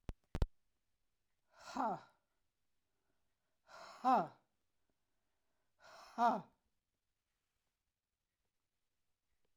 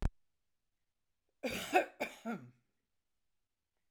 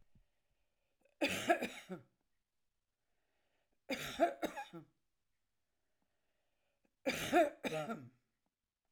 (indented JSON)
{
  "exhalation_length": "9.6 s",
  "exhalation_amplitude": 3692,
  "exhalation_signal_mean_std_ratio": 0.24,
  "cough_length": "3.9 s",
  "cough_amplitude": 6233,
  "cough_signal_mean_std_ratio": 0.29,
  "three_cough_length": "8.9 s",
  "three_cough_amplitude": 4417,
  "three_cough_signal_mean_std_ratio": 0.32,
  "survey_phase": "alpha (2021-03-01 to 2021-08-12)",
  "age": "65+",
  "gender": "Female",
  "wearing_mask": "No",
  "symptom_none": true,
  "smoker_status": "Ex-smoker",
  "respiratory_condition_asthma": true,
  "respiratory_condition_other": false,
  "recruitment_source": "REACT",
  "submission_delay": "2 days",
  "covid_test_result": "Negative",
  "covid_test_method": "RT-qPCR"
}